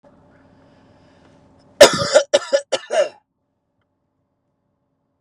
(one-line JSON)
{"cough_length": "5.2 s", "cough_amplitude": 32768, "cough_signal_mean_std_ratio": 0.26, "survey_phase": "beta (2021-08-13 to 2022-03-07)", "age": "18-44", "gender": "Male", "wearing_mask": "No", "symptom_none": true, "smoker_status": "Ex-smoker", "respiratory_condition_asthma": false, "respiratory_condition_other": false, "recruitment_source": "REACT", "submission_delay": "1 day", "covid_test_result": "Negative", "covid_test_method": "RT-qPCR"}